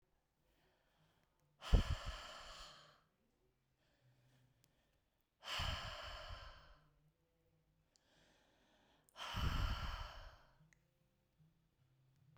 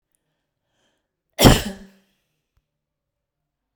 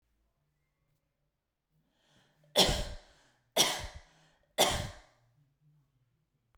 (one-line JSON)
{"exhalation_length": "12.4 s", "exhalation_amplitude": 3369, "exhalation_signal_mean_std_ratio": 0.31, "cough_length": "3.8 s", "cough_amplitude": 32768, "cough_signal_mean_std_ratio": 0.19, "three_cough_length": "6.6 s", "three_cough_amplitude": 10632, "three_cough_signal_mean_std_ratio": 0.28, "survey_phase": "beta (2021-08-13 to 2022-03-07)", "age": "45-64", "gender": "Female", "wearing_mask": "No", "symptom_none": true, "smoker_status": "Never smoked", "respiratory_condition_asthma": false, "respiratory_condition_other": false, "recruitment_source": "REACT", "submission_delay": "1 day", "covid_test_result": "Negative", "covid_test_method": "RT-qPCR"}